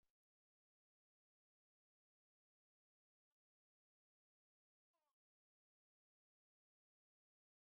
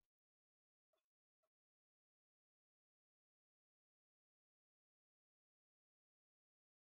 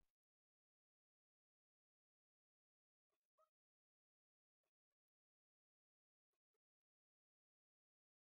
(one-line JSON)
{"exhalation_length": "7.7 s", "exhalation_amplitude": 4, "exhalation_signal_mean_std_ratio": 0.12, "cough_length": "6.9 s", "cough_amplitude": 6, "cough_signal_mean_std_ratio": 0.1, "three_cough_length": "8.3 s", "three_cough_amplitude": 11, "three_cough_signal_mean_std_ratio": 0.13, "survey_phase": "beta (2021-08-13 to 2022-03-07)", "age": "65+", "gender": "Female", "wearing_mask": "No", "symptom_none": true, "smoker_status": "Never smoked", "respiratory_condition_asthma": true, "respiratory_condition_other": false, "recruitment_source": "REACT", "submission_delay": "2 days", "covid_test_result": "Negative", "covid_test_method": "RT-qPCR", "influenza_a_test_result": "Negative", "influenza_b_test_result": "Negative"}